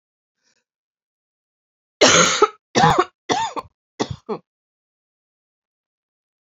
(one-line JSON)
{"three_cough_length": "6.6 s", "three_cough_amplitude": 29979, "three_cough_signal_mean_std_ratio": 0.3, "survey_phase": "beta (2021-08-13 to 2022-03-07)", "age": "18-44", "gender": "Female", "wearing_mask": "No", "symptom_cough_any": true, "symptom_runny_or_blocked_nose": true, "symptom_sore_throat": true, "symptom_abdominal_pain": true, "symptom_fatigue": true, "symptom_fever_high_temperature": true, "symptom_headache": true, "smoker_status": "Never smoked", "respiratory_condition_asthma": false, "respiratory_condition_other": false, "recruitment_source": "Test and Trace", "submission_delay": "1 day", "covid_test_result": "Positive", "covid_test_method": "RT-qPCR", "covid_ct_value": 19.6, "covid_ct_gene": "ORF1ab gene", "covid_ct_mean": 21.0, "covid_viral_load": "130000 copies/ml", "covid_viral_load_category": "Low viral load (10K-1M copies/ml)"}